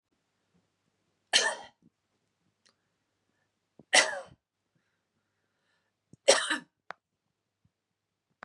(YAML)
three_cough_length: 8.4 s
three_cough_amplitude: 16457
three_cough_signal_mean_std_ratio: 0.2
survey_phase: beta (2021-08-13 to 2022-03-07)
age: 18-44
gender: Female
wearing_mask: 'No'
symptom_none: true
smoker_status: Ex-smoker
respiratory_condition_asthma: false
respiratory_condition_other: false
recruitment_source: REACT
submission_delay: 4 days
covid_test_result: Negative
covid_test_method: RT-qPCR
influenza_a_test_result: Negative
influenza_b_test_result: Negative